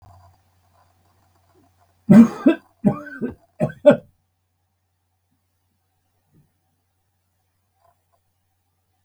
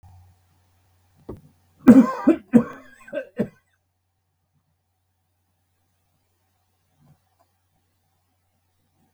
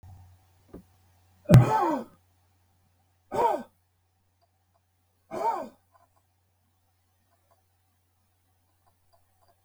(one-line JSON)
{"three_cough_length": "9.0 s", "three_cough_amplitude": 32766, "three_cough_signal_mean_std_ratio": 0.2, "cough_length": "9.1 s", "cough_amplitude": 32768, "cough_signal_mean_std_ratio": 0.19, "exhalation_length": "9.6 s", "exhalation_amplitude": 22073, "exhalation_signal_mean_std_ratio": 0.23, "survey_phase": "beta (2021-08-13 to 2022-03-07)", "age": "65+", "gender": "Male", "wearing_mask": "No", "symptom_cough_any": true, "smoker_status": "Never smoked", "respiratory_condition_asthma": false, "respiratory_condition_other": false, "recruitment_source": "REACT", "submission_delay": "2 days", "covid_test_result": "Negative", "covid_test_method": "RT-qPCR", "influenza_a_test_result": "Negative", "influenza_b_test_result": "Negative"}